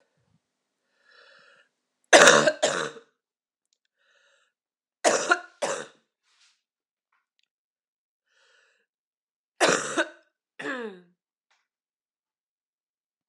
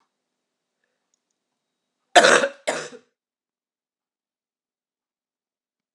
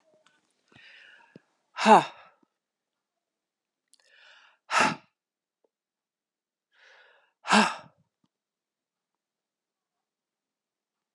{"three_cough_length": "13.3 s", "three_cough_amplitude": 32767, "three_cough_signal_mean_std_ratio": 0.24, "cough_length": "5.9 s", "cough_amplitude": 32734, "cough_signal_mean_std_ratio": 0.19, "exhalation_length": "11.1 s", "exhalation_amplitude": 20245, "exhalation_signal_mean_std_ratio": 0.18, "survey_phase": "beta (2021-08-13 to 2022-03-07)", "age": "18-44", "gender": "Female", "wearing_mask": "No", "symptom_cough_any": true, "symptom_runny_or_blocked_nose": true, "symptom_sore_throat": true, "symptom_fatigue": true, "symptom_headache": true, "smoker_status": "Ex-smoker", "respiratory_condition_asthma": false, "respiratory_condition_other": false, "recruitment_source": "Test and Trace", "submission_delay": "2 days", "covid_test_result": "Positive", "covid_test_method": "RT-qPCR", "covid_ct_value": 21.9, "covid_ct_gene": "ORF1ab gene"}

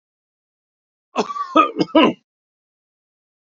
{"cough_length": "3.5 s", "cough_amplitude": 32767, "cough_signal_mean_std_ratio": 0.31, "survey_phase": "beta (2021-08-13 to 2022-03-07)", "age": "65+", "gender": "Male", "wearing_mask": "No", "symptom_none": true, "smoker_status": "Ex-smoker", "respiratory_condition_asthma": false, "respiratory_condition_other": false, "recruitment_source": "REACT", "submission_delay": "1 day", "covid_test_result": "Negative", "covid_test_method": "RT-qPCR"}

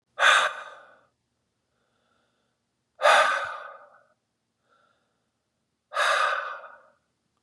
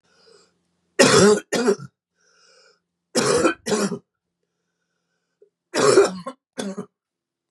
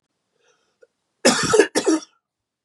{"exhalation_length": "7.4 s", "exhalation_amplitude": 17998, "exhalation_signal_mean_std_ratio": 0.34, "three_cough_length": "7.5 s", "three_cough_amplitude": 29216, "three_cough_signal_mean_std_ratio": 0.39, "cough_length": "2.6 s", "cough_amplitude": 30493, "cough_signal_mean_std_ratio": 0.37, "survey_phase": "beta (2021-08-13 to 2022-03-07)", "age": "45-64", "gender": "Male", "wearing_mask": "No", "symptom_runny_or_blocked_nose": true, "symptom_fatigue": true, "symptom_other": true, "smoker_status": "Never smoked", "respiratory_condition_asthma": false, "respiratory_condition_other": false, "recruitment_source": "Test and Trace", "submission_delay": "1 day", "covid_test_result": "Positive", "covid_test_method": "LFT"}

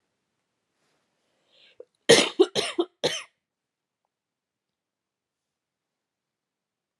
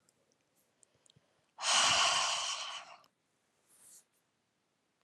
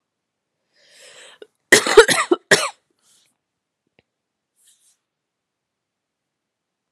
{"three_cough_length": "7.0 s", "three_cough_amplitude": 24112, "three_cough_signal_mean_std_ratio": 0.2, "exhalation_length": "5.0 s", "exhalation_amplitude": 5747, "exhalation_signal_mean_std_ratio": 0.38, "cough_length": "6.9 s", "cough_amplitude": 32768, "cough_signal_mean_std_ratio": 0.2, "survey_phase": "alpha (2021-03-01 to 2021-08-12)", "age": "18-44", "gender": "Female", "wearing_mask": "No", "symptom_cough_any": true, "symptom_headache": true, "symptom_onset": "5 days", "smoker_status": "Never smoked", "respiratory_condition_asthma": false, "respiratory_condition_other": false, "recruitment_source": "Test and Trace", "submission_delay": "2 days", "covid_test_result": "Positive", "covid_test_method": "RT-qPCR", "covid_ct_value": 15.8, "covid_ct_gene": "N gene", "covid_ct_mean": 17.1, "covid_viral_load": "2500000 copies/ml", "covid_viral_load_category": "High viral load (>1M copies/ml)"}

